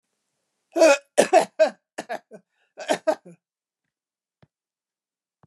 {"cough_length": "5.5 s", "cough_amplitude": 28126, "cough_signal_mean_std_ratio": 0.28, "survey_phase": "beta (2021-08-13 to 2022-03-07)", "age": "65+", "gender": "Female", "wearing_mask": "No", "symptom_none": true, "smoker_status": "Ex-smoker", "respiratory_condition_asthma": false, "respiratory_condition_other": false, "recruitment_source": "REACT", "submission_delay": "1 day", "covid_test_result": "Negative", "covid_test_method": "RT-qPCR", "influenza_a_test_result": "Negative", "influenza_b_test_result": "Negative"}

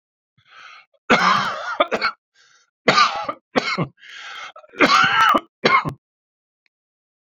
{"three_cough_length": "7.3 s", "three_cough_amplitude": 28630, "three_cough_signal_mean_std_ratio": 0.45, "survey_phase": "beta (2021-08-13 to 2022-03-07)", "age": "45-64", "gender": "Male", "wearing_mask": "No", "symptom_cough_any": true, "symptom_runny_or_blocked_nose": true, "symptom_fatigue": true, "symptom_onset": "2 days", "smoker_status": "Never smoked", "respiratory_condition_asthma": false, "respiratory_condition_other": false, "recruitment_source": "Test and Trace", "submission_delay": "2 days", "covid_test_result": "Positive", "covid_test_method": "RT-qPCR", "covid_ct_value": 19.9, "covid_ct_gene": "N gene", "covid_ct_mean": 21.3, "covid_viral_load": "100000 copies/ml", "covid_viral_load_category": "Low viral load (10K-1M copies/ml)"}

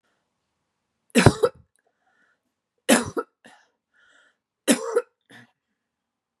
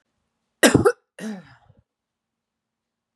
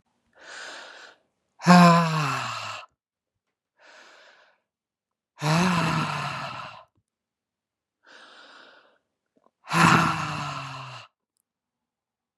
{"three_cough_length": "6.4 s", "three_cough_amplitude": 32595, "three_cough_signal_mean_std_ratio": 0.24, "cough_length": "3.2 s", "cough_amplitude": 30140, "cough_signal_mean_std_ratio": 0.24, "exhalation_length": "12.4 s", "exhalation_amplitude": 31909, "exhalation_signal_mean_std_ratio": 0.35, "survey_phase": "beta (2021-08-13 to 2022-03-07)", "age": "45-64", "gender": "Female", "wearing_mask": "No", "symptom_fatigue": true, "smoker_status": "Current smoker (1 to 10 cigarettes per day)", "respiratory_condition_asthma": false, "respiratory_condition_other": false, "recruitment_source": "Test and Trace", "submission_delay": "1 day", "covid_test_result": "Positive", "covid_test_method": "LFT"}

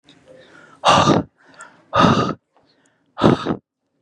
{"exhalation_length": "4.0 s", "exhalation_amplitude": 32767, "exhalation_signal_mean_std_ratio": 0.42, "survey_phase": "beta (2021-08-13 to 2022-03-07)", "age": "18-44", "gender": "Male", "wearing_mask": "Yes", "symptom_none": true, "smoker_status": "Never smoked", "respiratory_condition_asthma": false, "respiratory_condition_other": false, "recruitment_source": "REACT", "submission_delay": "2 days", "covid_test_result": "Negative", "covid_test_method": "RT-qPCR", "influenza_a_test_result": "Negative", "influenza_b_test_result": "Negative"}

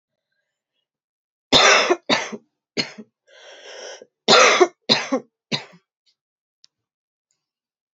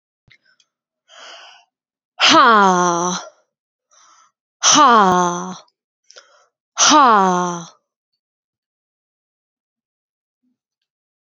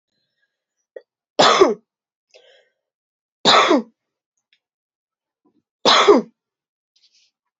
{"cough_length": "7.9 s", "cough_amplitude": 32768, "cough_signal_mean_std_ratio": 0.32, "exhalation_length": "11.3 s", "exhalation_amplitude": 32767, "exhalation_signal_mean_std_ratio": 0.36, "three_cough_length": "7.6 s", "three_cough_amplitude": 29589, "three_cough_signal_mean_std_ratio": 0.3, "survey_phase": "alpha (2021-03-01 to 2021-08-12)", "age": "18-44", "gender": "Female", "wearing_mask": "No", "symptom_cough_any": true, "symptom_fatigue": true, "symptom_fever_high_temperature": true, "symptom_headache": true, "smoker_status": "Never smoked", "respiratory_condition_asthma": false, "respiratory_condition_other": false, "recruitment_source": "Test and Trace", "submission_delay": "3 days", "covid_test_result": "Positive", "covid_test_method": "RT-qPCR", "covid_ct_value": 19.8, "covid_ct_gene": "ORF1ab gene", "covid_ct_mean": 20.4, "covid_viral_load": "210000 copies/ml", "covid_viral_load_category": "Low viral load (10K-1M copies/ml)"}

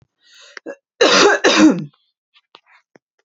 {"cough_length": "3.2 s", "cough_amplitude": 29981, "cough_signal_mean_std_ratio": 0.41, "survey_phase": "beta (2021-08-13 to 2022-03-07)", "age": "18-44", "gender": "Female", "wearing_mask": "No", "symptom_cough_any": true, "symptom_diarrhoea": true, "symptom_fatigue": true, "symptom_headache": true, "symptom_change_to_sense_of_smell_or_taste": true, "symptom_onset": "1 day", "smoker_status": "Never smoked", "respiratory_condition_asthma": false, "respiratory_condition_other": false, "recruitment_source": "Test and Trace", "submission_delay": "0 days", "covid_test_result": "Negative", "covid_test_method": "RT-qPCR"}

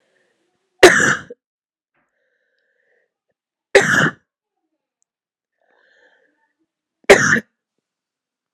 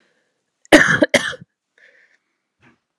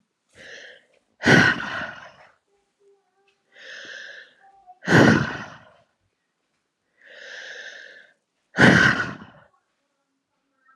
{"three_cough_length": "8.5 s", "three_cough_amplitude": 32768, "three_cough_signal_mean_std_ratio": 0.24, "cough_length": "3.0 s", "cough_amplitude": 32768, "cough_signal_mean_std_ratio": 0.28, "exhalation_length": "10.8 s", "exhalation_amplitude": 30183, "exhalation_signal_mean_std_ratio": 0.31, "survey_phase": "alpha (2021-03-01 to 2021-08-12)", "age": "18-44", "gender": "Female", "wearing_mask": "No", "symptom_cough_any": true, "symptom_shortness_of_breath": true, "symptom_fatigue": true, "symptom_headache": true, "symptom_onset": "3 days", "smoker_status": "Never smoked", "respiratory_condition_asthma": false, "respiratory_condition_other": false, "recruitment_source": "Test and Trace", "submission_delay": "2 days", "covid_test_result": "Positive", "covid_test_method": "RT-qPCR", "covid_ct_value": 18.2, "covid_ct_gene": "S gene", "covid_ct_mean": 18.6, "covid_viral_load": "800000 copies/ml", "covid_viral_load_category": "Low viral load (10K-1M copies/ml)"}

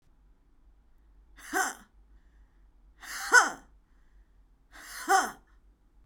{"exhalation_length": "6.1 s", "exhalation_amplitude": 16983, "exhalation_signal_mean_std_ratio": 0.28, "survey_phase": "alpha (2021-03-01 to 2021-08-12)", "age": "18-44", "gender": "Female", "wearing_mask": "No", "symptom_cough_any": true, "symptom_headache": true, "smoker_status": "Ex-smoker", "respiratory_condition_asthma": false, "respiratory_condition_other": false, "recruitment_source": "Test and Trace", "submission_delay": "2 days", "covid_test_result": "Positive", "covid_test_method": "RT-qPCR", "covid_ct_value": 23.1, "covid_ct_gene": "ORF1ab gene", "covid_ct_mean": 23.8, "covid_viral_load": "15000 copies/ml", "covid_viral_load_category": "Low viral load (10K-1M copies/ml)"}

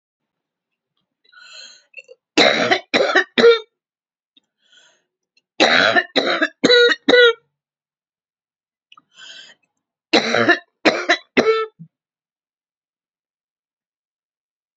{"three_cough_length": "14.8 s", "three_cough_amplitude": 32767, "three_cough_signal_mean_std_ratio": 0.36, "survey_phase": "beta (2021-08-13 to 2022-03-07)", "age": "65+", "gender": "Female", "wearing_mask": "No", "symptom_cough_any": true, "smoker_status": "Never smoked", "respiratory_condition_asthma": false, "respiratory_condition_other": false, "recruitment_source": "REACT", "submission_delay": "2 days", "covid_test_result": "Negative", "covid_test_method": "RT-qPCR", "influenza_a_test_result": "Negative", "influenza_b_test_result": "Negative"}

